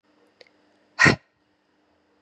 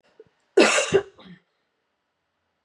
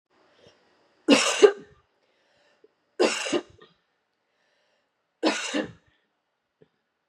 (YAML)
exhalation_length: 2.2 s
exhalation_amplitude: 28716
exhalation_signal_mean_std_ratio: 0.21
cough_length: 2.6 s
cough_amplitude: 22889
cough_signal_mean_std_ratio: 0.31
three_cough_length: 7.1 s
three_cough_amplitude: 27613
three_cough_signal_mean_std_ratio: 0.27
survey_phase: beta (2021-08-13 to 2022-03-07)
age: 18-44
gender: Female
wearing_mask: 'No'
symptom_cough_any: true
symptom_runny_or_blocked_nose: true
symptom_shortness_of_breath: true
symptom_fatigue: true
symptom_loss_of_taste: true
symptom_onset: 3 days
smoker_status: Never smoked
respiratory_condition_asthma: false
respiratory_condition_other: false
recruitment_source: Test and Trace
submission_delay: 2 days
covid_test_result: Positive
covid_test_method: RT-qPCR
covid_ct_value: 17.0
covid_ct_gene: ORF1ab gene
covid_ct_mean: 17.8
covid_viral_load: 1400000 copies/ml
covid_viral_load_category: High viral load (>1M copies/ml)